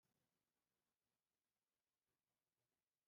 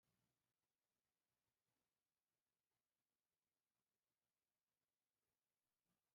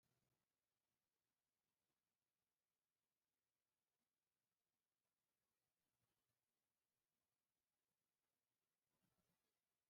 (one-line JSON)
{"cough_length": "3.1 s", "cough_amplitude": 5, "cough_signal_mean_std_ratio": 0.49, "three_cough_length": "6.1 s", "three_cough_amplitude": 4, "three_cough_signal_mean_std_ratio": 0.45, "exhalation_length": "9.9 s", "exhalation_amplitude": 5, "exhalation_signal_mean_std_ratio": 0.46, "survey_phase": "beta (2021-08-13 to 2022-03-07)", "age": "65+", "gender": "Male", "wearing_mask": "No", "symptom_none": true, "symptom_onset": "3 days", "smoker_status": "Never smoked", "respiratory_condition_asthma": false, "respiratory_condition_other": false, "recruitment_source": "REACT", "submission_delay": "1 day", "covid_test_result": "Negative", "covid_test_method": "RT-qPCR"}